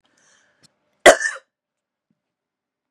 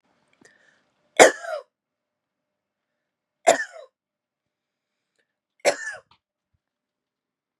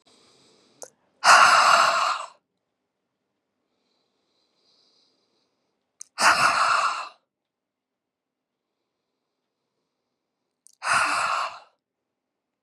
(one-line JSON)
{"cough_length": "2.9 s", "cough_amplitude": 32768, "cough_signal_mean_std_ratio": 0.17, "three_cough_length": "7.6 s", "three_cough_amplitude": 32768, "three_cough_signal_mean_std_ratio": 0.17, "exhalation_length": "12.6 s", "exhalation_amplitude": 25147, "exhalation_signal_mean_std_ratio": 0.33, "survey_phase": "beta (2021-08-13 to 2022-03-07)", "age": "45-64", "gender": "Female", "wearing_mask": "No", "symptom_none": true, "symptom_onset": "9 days", "smoker_status": "Ex-smoker", "respiratory_condition_asthma": false, "respiratory_condition_other": false, "recruitment_source": "REACT", "submission_delay": "0 days", "covid_test_result": "Negative", "covid_test_method": "RT-qPCR", "influenza_a_test_result": "Negative", "influenza_b_test_result": "Negative"}